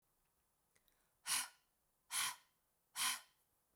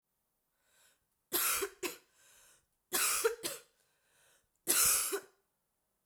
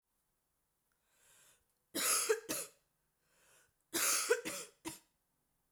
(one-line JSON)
{"exhalation_length": "3.8 s", "exhalation_amplitude": 1541, "exhalation_signal_mean_std_ratio": 0.34, "three_cough_length": "6.1 s", "three_cough_amplitude": 8293, "three_cough_signal_mean_std_ratio": 0.4, "cough_length": "5.7 s", "cough_amplitude": 3588, "cough_signal_mean_std_ratio": 0.37, "survey_phase": "beta (2021-08-13 to 2022-03-07)", "age": "18-44", "gender": "Female", "wearing_mask": "No", "symptom_cough_any": true, "symptom_runny_or_blocked_nose": true, "symptom_sore_throat": true, "symptom_fatigue": true, "symptom_onset": "3 days", "smoker_status": "Never smoked", "respiratory_condition_asthma": false, "respiratory_condition_other": false, "recruitment_source": "Test and Trace", "submission_delay": "1 day", "covid_test_result": "Positive", "covid_test_method": "RT-qPCR", "covid_ct_value": 22.0, "covid_ct_gene": "N gene"}